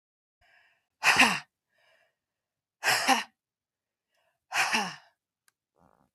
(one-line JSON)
{"exhalation_length": "6.1 s", "exhalation_amplitude": 13872, "exhalation_signal_mean_std_ratio": 0.31, "survey_phase": "beta (2021-08-13 to 2022-03-07)", "age": "45-64", "gender": "Female", "wearing_mask": "No", "symptom_cough_any": true, "symptom_onset": "11 days", "smoker_status": "Ex-smoker", "respiratory_condition_asthma": true, "respiratory_condition_other": false, "recruitment_source": "REACT", "submission_delay": "2 days", "covid_test_result": "Negative", "covid_test_method": "RT-qPCR", "influenza_a_test_result": "Negative", "influenza_b_test_result": "Negative"}